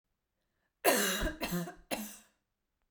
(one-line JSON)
{"three_cough_length": "2.9 s", "three_cough_amplitude": 8186, "three_cough_signal_mean_std_ratio": 0.45, "survey_phase": "beta (2021-08-13 to 2022-03-07)", "age": "18-44", "gender": "Female", "wearing_mask": "No", "symptom_cough_any": true, "symptom_onset": "7 days", "smoker_status": "Never smoked", "respiratory_condition_asthma": true, "respiratory_condition_other": false, "recruitment_source": "REACT", "submission_delay": "1 day", "covid_test_result": "Negative", "covid_test_method": "RT-qPCR"}